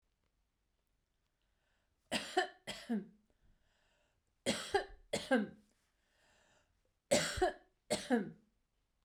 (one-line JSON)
{"three_cough_length": "9.0 s", "three_cough_amplitude": 4409, "three_cough_signal_mean_std_ratio": 0.34, "survey_phase": "beta (2021-08-13 to 2022-03-07)", "age": "45-64", "gender": "Female", "wearing_mask": "No", "symptom_sore_throat": true, "symptom_onset": "12 days", "smoker_status": "Ex-smoker", "respiratory_condition_asthma": false, "respiratory_condition_other": false, "recruitment_source": "REACT", "submission_delay": "1 day", "covid_test_result": "Negative", "covid_test_method": "RT-qPCR", "influenza_a_test_result": "Negative", "influenza_b_test_result": "Negative"}